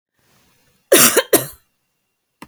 {"cough_length": "2.5 s", "cough_amplitude": 32768, "cough_signal_mean_std_ratio": 0.31, "survey_phase": "beta (2021-08-13 to 2022-03-07)", "age": "45-64", "gender": "Female", "wearing_mask": "No", "symptom_none": true, "smoker_status": "Never smoked", "respiratory_condition_asthma": false, "respiratory_condition_other": false, "recruitment_source": "REACT", "submission_delay": "1 day", "covid_test_result": "Negative", "covid_test_method": "RT-qPCR"}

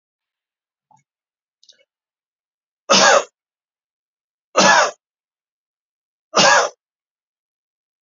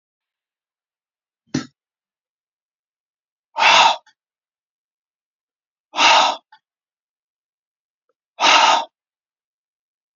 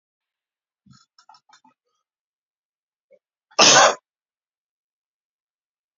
{"three_cough_length": "8.0 s", "three_cough_amplitude": 32768, "three_cough_signal_mean_std_ratio": 0.28, "exhalation_length": "10.2 s", "exhalation_amplitude": 31829, "exhalation_signal_mean_std_ratio": 0.28, "cough_length": "6.0 s", "cough_amplitude": 32768, "cough_signal_mean_std_ratio": 0.19, "survey_phase": "beta (2021-08-13 to 2022-03-07)", "age": "45-64", "gender": "Male", "wearing_mask": "No", "symptom_none": true, "smoker_status": "Ex-smoker", "respiratory_condition_asthma": false, "respiratory_condition_other": false, "recruitment_source": "REACT", "submission_delay": "1 day", "covid_test_result": "Negative", "covid_test_method": "RT-qPCR"}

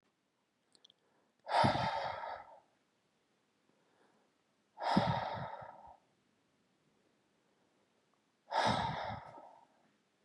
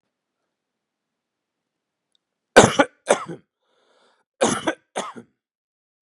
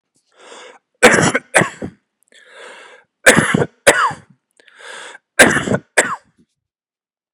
{"exhalation_length": "10.2 s", "exhalation_amplitude": 4806, "exhalation_signal_mean_std_ratio": 0.37, "cough_length": "6.1 s", "cough_amplitude": 32768, "cough_signal_mean_std_ratio": 0.21, "three_cough_length": "7.3 s", "three_cough_amplitude": 32768, "three_cough_signal_mean_std_ratio": 0.36, "survey_phase": "beta (2021-08-13 to 2022-03-07)", "age": "18-44", "gender": "Male", "wearing_mask": "No", "symptom_none": true, "smoker_status": "Never smoked", "respiratory_condition_asthma": false, "respiratory_condition_other": false, "recruitment_source": "REACT", "submission_delay": "2 days", "covid_test_result": "Negative", "covid_test_method": "RT-qPCR", "influenza_a_test_result": "Negative", "influenza_b_test_result": "Negative"}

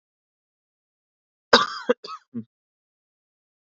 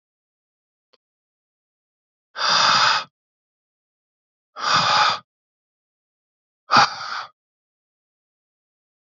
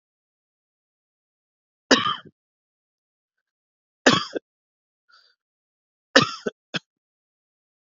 {"cough_length": "3.7 s", "cough_amplitude": 29500, "cough_signal_mean_std_ratio": 0.19, "exhalation_length": "9.0 s", "exhalation_amplitude": 28192, "exhalation_signal_mean_std_ratio": 0.32, "three_cough_length": "7.9 s", "three_cough_amplitude": 30481, "three_cough_signal_mean_std_ratio": 0.19, "survey_phase": "beta (2021-08-13 to 2022-03-07)", "age": "18-44", "gender": "Male", "wearing_mask": "No", "symptom_cough_any": true, "symptom_runny_or_blocked_nose": true, "symptom_sore_throat": true, "symptom_fatigue": true, "symptom_fever_high_temperature": true, "symptom_onset": "2 days", "smoker_status": "Never smoked", "respiratory_condition_asthma": false, "respiratory_condition_other": false, "recruitment_source": "Test and Trace", "submission_delay": "1 day", "covid_test_result": "Positive", "covid_test_method": "RT-qPCR", "covid_ct_value": 12.5, "covid_ct_gene": "ORF1ab gene"}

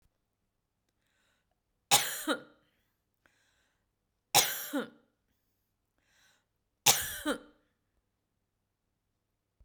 {"three_cough_length": "9.6 s", "three_cough_amplitude": 17624, "three_cough_signal_mean_std_ratio": 0.23, "survey_phase": "beta (2021-08-13 to 2022-03-07)", "age": "45-64", "gender": "Female", "wearing_mask": "No", "symptom_none": true, "smoker_status": "Never smoked", "respiratory_condition_asthma": false, "respiratory_condition_other": false, "recruitment_source": "REACT", "submission_delay": "2 days", "covid_test_result": "Negative", "covid_test_method": "RT-qPCR", "influenza_a_test_result": "Negative", "influenza_b_test_result": "Negative"}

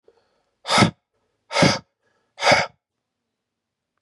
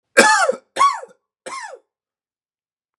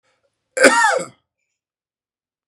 {"exhalation_length": "4.0 s", "exhalation_amplitude": 27179, "exhalation_signal_mean_std_ratio": 0.32, "three_cough_length": "3.0 s", "three_cough_amplitude": 32768, "three_cough_signal_mean_std_ratio": 0.36, "cough_length": "2.5 s", "cough_amplitude": 32768, "cough_signal_mean_std_ratio": 0.33, "survey_phase": "beta (2021-08-13 to 2022-03-07)", "age": "18-44", "gender": "Male", "wearing_mask": "No", "symptom_runny_or_blocked_nose": true, "symptom_shortness_of_breath": true, "symptom_fatigue": true, "symptom_change_to_sense_of_smell_or_taste": true, "symptom_onset": "4 days", "smoker_status": "Ex-smoker", "respiratory_condition_asthma": false, "respiratory_condition_other": false, "recruitment_source": "Test and Trace", "submission_delay": "2 days", "covid_test_result": "Positive", "covid_test_method": "RT-qPCR", "covid_ct_value": 18.6, "covid_ct_gene": "ORF1ab gene"}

